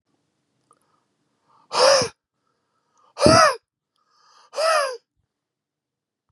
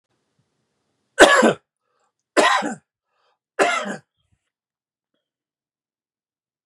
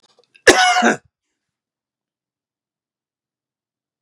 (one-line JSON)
{"exhalation_length": "6.3 s", "exhalation_amplitude": 31535, "exhalation_signal_mean_std_ratio": 0.32, "three_cough_length": "6.7 s", "three_cough_amplitude": 32768, "three_cough_signal_mean_std_ratio": 0.27, "cough_length": "4.0 s", "cough_amplitude": 32768, "cough_signal_mean_std_ratio": 0.26, "survey_phase": "beta (2021-08-13 to 2022-03-07)", "age": "45-64", "gender": "Male", "wearing_mask": "No", "symptom_none": true, "smoker_status": "Never smoked", "respiratory_condition_asthma": false, "respiratory_condition_other": false, "recruitment_source": "REACT", "submission_delay": "1 day", "covid_test_result": "Negative", "covid_test_method": "RT-qPCR", "influenza_a_test_result": "Negative", "influenza_b_test_result": "Negative"}